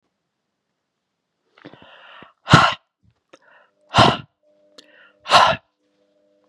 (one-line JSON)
{"exhalation_length": "6.5 s", "exhalation_amplitude": 32768, "exhalation_signal_mean_std_ratio": 0.26, "survey_phase": "beta (2021-08-13 to 2022-03-07)", "age": "45-64", "gender": "Male", "wearing_mask": "No", "symptom_none": true, "smoker_status": "Never smoked", "respiratory_condition_asthma": false, "respiratory_condition_other": false, "recruitment_source": "Test and Trace", "submission_delay": "1 day", "covid_test_result": "Positive", "covid_test_method": "RT-qPCR", "covid_ct_value": 25.7, "covid_ct_gene": "ORF1ab gene"}